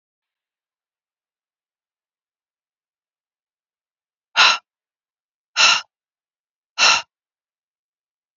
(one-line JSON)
{"exhalation_length": "8.4 s", "exhalation_amplitude": 28320, "exhalation_signal_mean_std_ratio": 0.21, "survey_phase": "beta (2021-08-13 to 2022-03-07)", "age": "45-64", "gender": "Female", "wearing_mask": "No", "symptom_none": true, "smoker_status": "Never smoked", "respiratory_condition_asthma": false, "respiratory_condition_other": false, "recruitment_source": "REACT", "submission_delay": "4 days", "covid_test_result": "Negative", "covid_test_method": "RT-qPCR", "influenza_a_test_result": "Negative", "influenza_b_test_result": "Negative"}